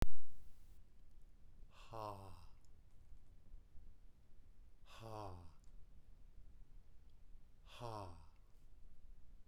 {"exhalation_length": "9.5 s", "exhalation_amplitude": 3417, "exhalation_signal_mean_std_ratio": 0.3, "survey_phase": "beta (2021-08-13 to 2022-03-07)", "age": "45-64", "gender": "Male", "wearing_mask": "No", "symptom_none": true, "smoker_status": "Never smoked", "respiratory_condition_asthma": false, "respiratory_condition_other": false, "recruitment_source": "REACT", "submission_delay": "5 days", "covid_test_result": "Negative", "covid_test_method": "RT-qPCR"}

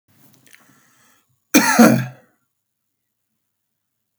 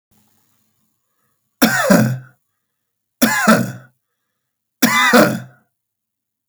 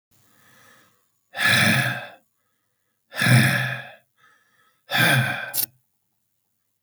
{"cough_length": "4.2 s", "cough_amplitude": 32768, "cough_signal_mean_std_ratio": 0.26, "three_cough_length": "6.5 s", "three_cough_amplitude": 32768, "three_cough_signal_mean_std_ratio": 0.39, "exhalation_length": "6.8 s", "exhalation_amplitude": 22528, "exhalation_signal_mean_std_ratio": 0.43, "survey_phase": "beta (2021-08-13 to 2022-03-07)", "age": "65+", "gender": "Male", "wearing_mask": "No", "symptom_none": true, "smoker_status": "Ex-smoker", "respiratory_condition_asthma": false, "respiratory_condition_other": false, "recruitment_source": "REACT", "submission_delay": "2 days", "covid_test_result": "Negative", "covid_test_method": "RT-qPCR", "influenza_a_test_result": "Negative", "influenza_b_test_result": "Negative"}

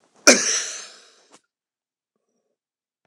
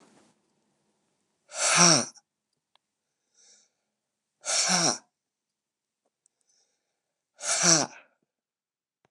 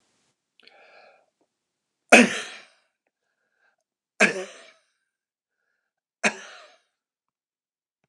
{"cough_length": "3.1 s", "cough_amplitude": 29204, "cough_signal_mean_std_ratio": 0.24, "exhalation_length": "9.1 s", "exhalation_amplitude": 20540, "exhalation_signal_mean_std_ratio": 0.29, "three_cough_length": "8.1 s", "three_cough_amplitude": 29204, "three_cough_signal_mean_std_ratio": 0.18, "survey_phase": "beta (2021-08-13 to 2022-03-07)", "age": "65+", "gender": "Male", "wearing_mask": "No", "symptom_none": true, "smoker_status": "Ex-smoker", "respiratory_condition_asthma": true, "respiratory_condition_other": false, "recruitment_source": "REACT", "submission_delay": "2 days", "covid_test_result": "Negative", "covid_test_method": "RT-qPCR", "influenza_a_test_result": "Negative", "influenza_b_test_result": "Negative"}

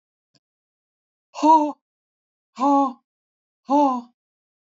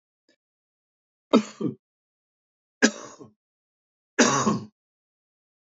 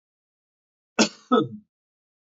{"exhalation_length": "4.7 s", "exhalation_amplitude": 19036, "exhalation_signal_mean_std_ratio": 0.36, "three_cough_length": "5.6 s", "three_cough_amplitude": 24061, "three_cough_signal_mean_std_ratio": 0.26, "cough_length": "2.3 s", "cough_amplitude": 19094, "cough_signal_mean_std_ratio": 0.26, "survey_phase": "beta (2021-08-13 to 2022-03-07)", "age": "45-64", "gender": "Male", "wearing_mask": "No", "symptom_none": true, "smoker_status": "Never smoked", "respiratory_condition_asthma": false, "respiratory_condition_other": false, "recruitment_source": "Test and Trace", "submission_delay": "0 days", "covid_test_result": "Negative", "covid_test_method": "LFT"}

